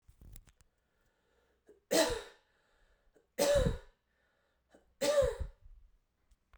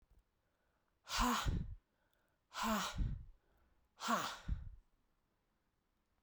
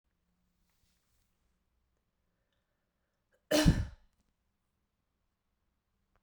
{"three_cough_length": "6.6 s", "three_cough_amplitude": 5322, "three_cough_signal_mean_std_ratio": 0.35, "exhalation_length": "6.2 s", "exhalation_amplitude": 2369, "exhalation_signal_mean_std_ratio": 0.45, "cough_length": "6.2 s", "cough_amplitude": 8079, "cough_signal_mean_std_ratio": 0.18, "survey_phase": "beta (2021-08-13 to 2022-03-07)", "age": "18-44", "gender": "Female", "wearing_mask": "No", "symptom_runny_or_blocked_nose": true, "symptom_shortness_of_breath": true, "symptom_headache": true, "symptom_change_to_sense_of_smell_or_taste": true, "symptom_loss_of_taste": true, "symptom_onset": "3 days", "smoker_status": "Never smoked", "respiratory_condition_asthma": false, "respiratory_condition_other": false, "recruitment_source": "Test and Trace", "submission_delay": "1 day", "covid_test_result": "Positive", "covid_test_method": "RT-qPCR"}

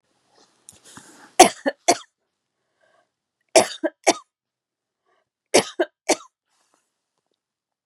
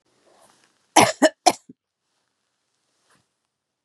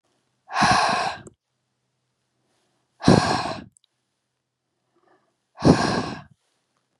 {"three_cough_length": "7.9 s", "three_cough_amplitude": 32768, "three_cough_signal_mean_std_ratio": 0.2, "cough_length": "3.8 s", "cough_amplitude": 32222, "cough_signal_mean_std_ratio": 0.2, "exhalation_length": "7.0 s", "exhalation_amplitude": 30009, "exhalation_signal_mean_std_ratio": 0.35, "survey_phase": "beta (2021-08-13 to 2022-03-07)", "age": "45-64", "gender": "Female", "wearing_mask": "No", "symptom_none": true, "smoker_status": "Ex-smoker", "respiratory_condition_asthma": false, "respiratory_condition_other": false, "recruitment_source": "REACT", "submission_delay": "1 day", "covid_test_result": "Negative", "covid_test_method": "RT-qPCR", "influenza_a_test_result": "Negative", "influenza_b_test_result": "Negative"}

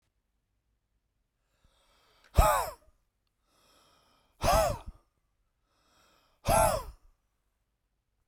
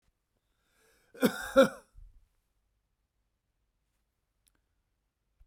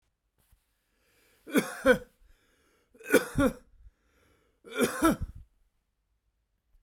{"exhalation_length": "8.3 s", "exhalation_amplitude": 11949, "exhalation_signal_mean_std_ratio": 0.28, "cough_length": "5.5 s", "cough_amplitude": 11162, "cough_signal_mean_std_ratio": 0.17, "three_cough_length": "6.8 s", "three_cough_amplitude": 12932, "three_cough_signal_mean_std_ratio": 0.3, "survey_phase": "beta (2021-08-13 to 2022-03-07)", "age": "65+", "gender": "Male", "wearing_mask": "No", "symptom_none": true, "smoker_status": "Never smoked", "respiratory_condition_asthma": false, "respiratory_condition_other": false, "recruitment_source": "REACT", "submission_delay": "1 day", "covid_test_result": "Negative", "covid_test_method": "RT-qPCR"}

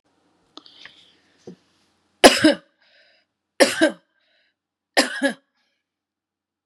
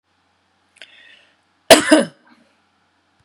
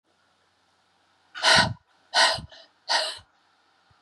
{"three_cough_length": "6.7 s", "three_cough_amplitude": 32768, "three_cough_signal_mean_std_ratio": 0.24, "cough_length": "3.2 s", "cough_amplitude": 32768, "cough_signal_mean_std_ratio": 0.22, "exhalation_length": "4.0 s", "exhalation_amplitude": 19583, "exhalation_signal_mean_std_ratio": 0.35, "survey_phase": "beta (2021-08-13 to 2022-03-07)", "age": "45-64", "gender": "Female", "wearing_mask": "No", "symptom_runny_or_blocked_nose": true, "symptom_fatigue": true, "symptom_headache": true, "symptom_onset": "12 days", "smoker_status": "Ex-smoker", "respiratory_condition_asthma": false, "respiratory_condition_other": false, "recruitment_source": "REACT", "submission_delay": "1 day", "covid_test_result": "Negative", "covid_test_method": "RT-qPCR", "influenza_a_test_result": "Negative", "influenza_b_test_result": "Negative"}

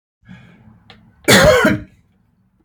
{"cough_length": "2.6 s", "cough_amplitude": 32768, "cough_signal_mean_std_ratio": 0.38, "survey_phase": "beta (2021-08-13 to 2022-03-07)", "age": "45-64", "gender": "Male", "wearing_mask": "No", "symptom_none": true, "smoker_status": "Ex-smoker", "respiratory_condition_asthma": false, "respiratory_condition_other": false, "recruitment_source": "REACT", "submission_delay": "0 days", "covid_test_result": "Negative", "covid_test_method": "RT-qPCR", "influenza_a_test_result": "Negative", "influenza_b_test_result": "Negative"}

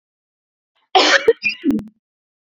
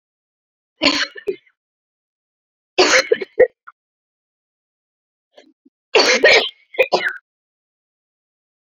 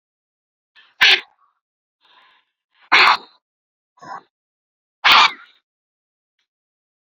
{"cough_length": "2.6 s", "cough_amplitude": 29394, "cough_signal_mean_std_ratio": 0.38, "three_cough_length": "8.8 s", "three_cough_amplitude": 32768, "three_cough_signal_mean_std_ratio": 0.31, "exhalation_length": "7.1 s", "exhalation_amplitude": 31824, "exhalation_signal_mean_std_ratio": 0.26, "survey_phase": "beta (2021-08-13 to 2022-03-07)", "age": "45-64", "gender": "Female", "wearing_mask": "Yes", "symptom_fatigue": true, "smoker_status": "Ex-smoker", "respiratory_condition_asthma": true, "respiratory_condition_other": false, "recruitment_source": "REACT", "submission_delay": "2 days", "covid_test_result": "Negative", "covid_test_method": "RT-qPCR"}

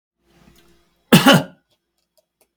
{"cough_length": "2.6 s", "cough_amplitude": 32768, "cough_signal_mean_std_ratio": 0.26, "survey_phase": "beta (2021-08-13 to 2022-03-07)", "age": "65+", "gender": "Male", "wearing_mask": "No", "symptom_none": true, "smoker_status": "Never smoked", "respiratory_condition_asthma": false, "respiratory_condition_other": false, "recruitment_source": "REACT", "submission_delay": "2 days", "covid_test_method": "RT-qPCR"}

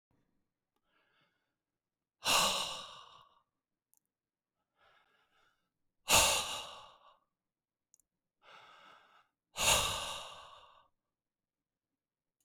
{"exhalation_length": "12.4 s", "exhalation_amplitude": 7158, "exhalation_signal_mean_std_ratio": 0.28, "survey_phase": "beta (2021-08-13 to 2022-03-07)", "age": "45-64", "gender": "Male", "wearing_mask": "No", "symptom_runny_or_blocked_nose": true, "smoker_status": "Never smoked", "respiratory_condition_asthma": false, "respiratory_condition_other": false, "recruitment_source": "Test and Trace", "submission_delay": "1 day", "covid_test_result": "Negative", "covid_test_method": "RT-qPCR"}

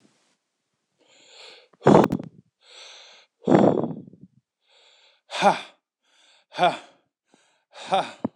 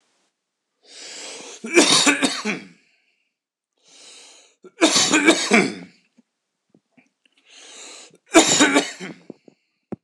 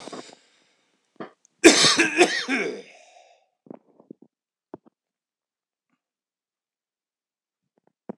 {"exhalation_length": "8.4 s", "exhalation_amplitude": 26028, "exhalation_signal_mean_std_ratio": 0.3, "three_cough_length": "10.0 s", "three_cough_amplitude": 26028, "three_cough_signal_mean_std_ratio": 0.38, "cough_length": "8.2 s", "cough_amplitude": 26028, "cough_signal_mean_std_ratio": 0.25, "survey_phase": "beta (2021-08-13 to 2022-03-07)", "age": "18-44", "gender": "Male", "wearing_mask": "No", "symptom_none": true, "smoker_status": "Ex-smoker", "respiratory_condition_asthma": false, "respiratory_condition_other": false, "recruitment_source": "REACT", "submission_delay": "2 days", "covid_test_result": "Negative", "covid_test_method": "RT-qPCR"}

